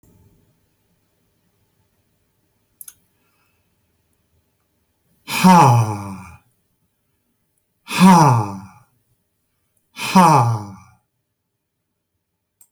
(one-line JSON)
{"exhalation_length": "12.7 s", "exhalation_amplitude": 32767, "exhalation_signal_mean_std_ratio": 0.3, "survey_phase": "beta (2021-08-13 to 2022-03-07)", "age": "65+", "gender": "Male", "wearing_mask": "No", "symptom_none": true, "smoker_status": "Never smoked", "respiratory_condition_asthma": false, "respiratory_condition_other": false, "recruitment_source": "REACT", "submission_delay": "3 days", "covid_test_result": "Negative", "covid_test_method": "RT-qPCR"}